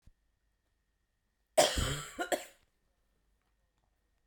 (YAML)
cough_length: 4.3 s
cough_amplitude: 8749
cough_signal_mean_std_ratio: 0.27
survey_phase: beta (2021-08-13 to 2022-03-07)
age: 18-44
gender: Female
wearing_mask: 'No'
symptom_cough_any: true
symptom_new_continuous_cough: true
symptom_runny_or_blocked_nose: true
symptom_fatigue: true
symptom_fever_high_temperature: true
symptom_headache: true
symptom_change_to_sense_of_smell_or_taste: true
symptom_loss_of_taste: true
symptom_onset: 2 days
smoker_status: Never smoked
respiratory_condition_asthma: false
respiratory_condition_other: false
recruitment_source: Test and Trace
submission_delay: 2 days
covid_test_result: Positive
covid_test_method: RT-qPCR
covid_ct_value: 16.6
covid_ct_gene: ORF1ab gene
covid_ct_mean: 17.2
covid_viral_load: 2400000 copies/ml
covid_viral_load_category: High viral load (>1M copies/ml)